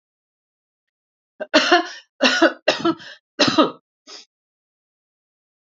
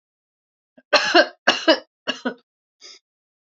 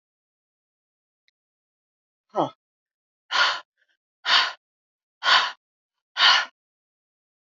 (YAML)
three_cough_length: 5.6 s
three_cough_amplitude: 28515
three_cough_signal_mean_std_ratio: 0.34
cough_length: 3.6 s
cough_amplitude: 28099
cough_signal_mean_std_ratio: 0.31
exhalation_length: 7.6 s
exhalation_amplitude: 23221
exhalation_signal_mean_std_ratio: 0.29
survey_phase: alpha (2021-03-01 to 2021-08-12)
age: 65+
gender: Female
wearing_mask: 'No'
symptom_none: true
smoker_status: Ex-smoker
respiratory_condition_asthma: false
respiratory_condition_other: false
recruitment_source: REACT
submission_delay: 1 day
covid_test_result: Negative
covid_test_method: RT-qPCR